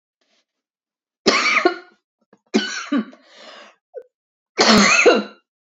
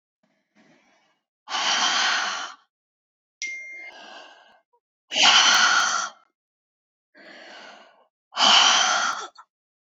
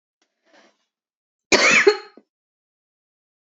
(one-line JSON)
{"three_cough_length": "5.6 s", "three_cough_amplitude": 32100, "three_cough_signal_mean_std_ratio": 0.41, "exhalation_length": "9.9 s", "exhalation_amplitude": 21797, "exhalation_signal_mean_std_ratio": 0.44, "cough_length": "3.4 s", "cough_amplitude": 27640, "cough_signal_mean_std_ratio": 0.28, "survey_phase": "beta (2021-08-13 to 2022-03-07)", "age": "45-64", "gender": "Female", "wearing_mask": "No", "symptom_cough_any": true, "symptom_runny_or_blocked_nose": true, "symptom_sore_throat": true, "symptom_diarrhoea": true, "symptom_fatigue": true, "symptom_fever_high_temperature": true, "symptom_headache": true, "symptom_change_to_sense_of_smell_or_taste": true, "symptom_onset": "3 days", "smoker_status": "Never smoked", "respiratory_condition_asthma": true, "respiratory_condition_other": false, "recruitment_source": "Test and Trace", "submission_delay": "2 days", "covid_test_result": "Positive", "covid_test_method": "RT-qPCR", "covid_ct_value": 27.9, "covid_ct_gene": "ORF1ab gene"}